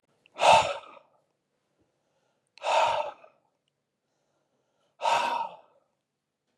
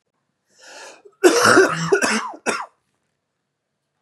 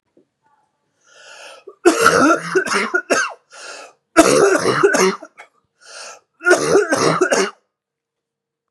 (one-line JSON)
{"exhalation_length": "6.6 s", "exhalation_amplitude": 16403, "exhalation_signal_mean_std_ratio": 0.33, "cough_length": "4.0 s", "cough_amplitude": 32622, "cough_signal_mean_std_ratio": 0.41, "three_cough_length": "8.7 s", "three_cough_amplitude": 32768, "three_cough_signal_mean_std_ratio": 0.51, "survey_phase": "beta (2021-08-13 to 2022-03-07)", "age": "45-64", "gender": "Male", "wearing_mask": "No", "symptom_cough_any": true, "symptom_runny_or_blocked_nose": true, "symptom_shortness_of_breath": true, "symptom_fatigue": true, "symptom_change_to_sense_of_smell_or_taste": true, "symptom_onset": "4 days", "smoker_status": "Never smoked", "respiratory_condition_asthma": false, "respiratory_condition_other": false, "recruitment_source": "Test and Trace", "submission_delay": "2 days", "covid_test_result": "Positive", "covid_test_method": "RT-qPCR", "covid_ct_value": 17.4, "covid_ct_gene": "S gene", "covid_ct_mean": 17.8, "covid_viral_load": "1400000 copies/ml", "covid_viral_load_category": "High viral load (>1M copies/ml)"}